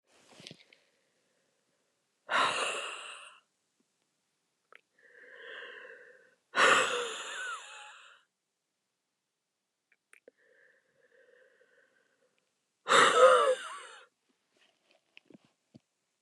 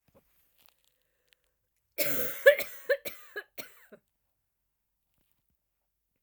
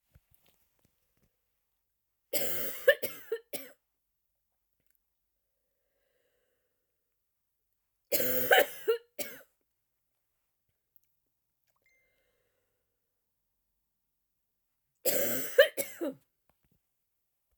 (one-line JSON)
{"exhalation_length": "16.2 s", "exhalation_amplitude": 11892, "exhalation_signal_mean_std_ratio": 0.28, "cough_length": "6.2 s", "cough_amplitude": 15071, "cough_signal_mean_std_ratio": 0.23, "three_cough_length": "17.6 s", "three_cough_amplitude": 12921, "three_cough_signal_mean_std_ratio": 0.25, "survey_phase": "alpha (2021-03-01 to 2021-08-12)", "age": "45-64", "gender": "Female", "wearing_mask": "No", "symptom_cough_any": true, "symptom_new_continuous_cough": true, "symptom_fatigue": true, "symptom_headache": true, "symptom_change_to_sense_of_smell_or_taste": true, "symptom_onset": "5 days", "smoker_status": "Ex-smoker", "respiratory_condition_asthma": false, "respiratory_condition_other": false, "recruitment_source": "Test and Trace", "submission_delay": "1 day", "covid_test_result": "Positive", "covid_test_method": "RT-qPCR", "covid_ct_value": 20.5, "covid_ct_gene": "N gene", "covid_ct_mean": 20.8, "covid_viral_load": "150000 copies/ml", "covid_viral_load_category": "Low viral load (10K-1M copies/ml)"}